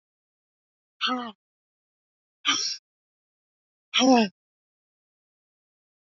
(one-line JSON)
{"exhalation_length": "6.1 s", "exhalation_amplitude": 14867, "exhalation_signal_mean_std_ratio": 0.27, "survey_phase": "alpha (2021-03-01 to 2021-08-12)", "age": "18-44", "gender": "Female", "wearing_mask": "No", "symptom_cough_any": true, "symptom_new_continuous_cough": true, "symptom_fatigue": true, "symptom_change_to_sense_of_smell_or_taste": true, "symptom_onset": "3 days", "smoker_status": "Never smoked", "respiratory_condition_asthma": false, "respiratory_condition_other": false, "recruitment_source": "Test and Trace", "submission_delay": "1 day", "covid_test_result": "Positive", "covid_test_method": "RT-qPCR", "covid_ct_value": 21.6, "covid_ct_gene": "ORF1ab gene", "covid_ct_mean": 22.1, "covid_viral_load": "58000 copies/ml", "covid_viral_load_category": "Low viral load (10K-1M copies/ml)"}